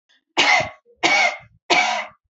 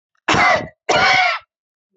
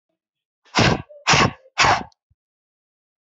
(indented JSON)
{
  "three_cough_length": "2.4 s",
  "three_cough_amplitude": 23872,
  "three_cough_signal_mean_std_ratio": 0.55,
  "cough_length": "2.0 s",
  "cough_amplitude": 25871,
  "cough_signal_mean_std_ratio": 0.59,
  "exhalation_length": "3.2 s",
  "exhalation_amplitude": 25656,
  "exhalation_signal_mean_std_ratio": 0.37,
  "survey_phase": "beta (2021-08-13 to 2022-03-07)",
  "age": "18-44",
  "gender": "Female",
  "wearing_mask": "No",
  "symptom_none": true,
  "smoker_status": "Never smoked",
  "respiratory_condition_asthma": false,
  "respiratory_condition_other": false,
  "recruitment_source": "REACT",
  "submission_delay": "7 days",
  "covid_test_result": "Negative",
  "covid_test_method": "RT-qPCR",
  "influenza_a_test_result": "Negative",
  "influenza_b_test_result": "Negative"
}